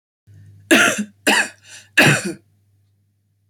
{"three_cough_length": "3.5 s", "three_cough_amplitude": 28198, "three_cough_signal_mean_std_ratio": 0.4, "survey_phase": "beta (2021-08-13 to 2022-03-07)", "age": "18-44", "gender": "Female", "wearing_mask": "Yes", "symptom_cough_any": true, "symptom_runny_or_blocked_nose": true, "symptom_onset": "8 days", "smoker_status": "Never smoked", "respiratory_condition_asthma": false, "respiratory_condition_other": false, "recruitment_source": "REACT", "submission_delay": "1 day", "covid_test_result": "Negative", "covid_test_method": "RT-qPCR"}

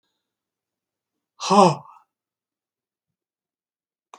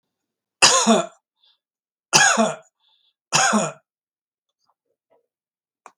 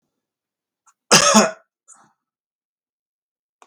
{"exhalation_length": "4.2 s", "exhalation_amplitude": 29333, "exhalation_signal_mean_std_ratio": 0.2, "three_cough_length": "6.0 s", "three_cough_amplitude": 32768, "three_cough_signal_mean_std_ratio": 0.35, "cough_length": "3.7 s", "cough_amplitude": 32768, "cough_signal_mean_std_ratio": 0.25, "survey_phase": "beta (2021-08-13 to 2022-03-07)", "age": "65+", "gender": "Male", "wearing_mask": "No", "symptom_none": true, "smoker_status": "Never smoked", "respiratory_condition_asthma": false, "respiratory_condition_other": false, "recruitment_source": "REACT", "submission_delay": "1 day", "covid_test_result": "Negative", "covid_test_method": "RT-qPCR", "influenza_a_test_result": "Unknown/Void", "influenza_b_test_result": "Unknown/Void"}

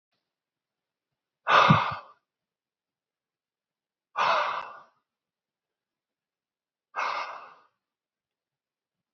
{"exhalation_length": "9.1 s", "exhalation_amplitude": 17707, "exhalation_signal_mean_std_ratio": 0.27, "survey_phase": "beta (2021-08-13 to 2022-03-07)", "age": "45-64", "gender": "Male", "wearing_mask": "No", "symptom_none": true, "smoker_status": "Ex-smoker", "respiratory_condition_asthma": false, "respiratory_condition_other": false, "recruitment_source": "REACT", "submission_delay": "2 days", "covid_test_result": "Negative", "covid_test_method": "RT-qPCR", "influenza_a_test_result": "Negative", "influenza_b_test_result": "Negative"}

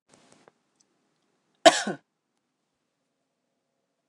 {"cough_length": "4.1 s", "cough_amplitude": 29108, "cough_signal_mean_std_ratio": 0.14, "survey_phase": "alpha (2021-03-01 to 2021-08-12)", "age": "45-64", "gender": "Female", "wearing_mask": "No", "symptom_none": true, "smoker_status": "Never smoked", "respiratory_condition_asthma": false, "respiratory_condition_other": false, "recruitment_source": "REACT", "submission_delay": "2 days", "covid_test_result": "Negative", "covid_test_method": "RT-qPCR"}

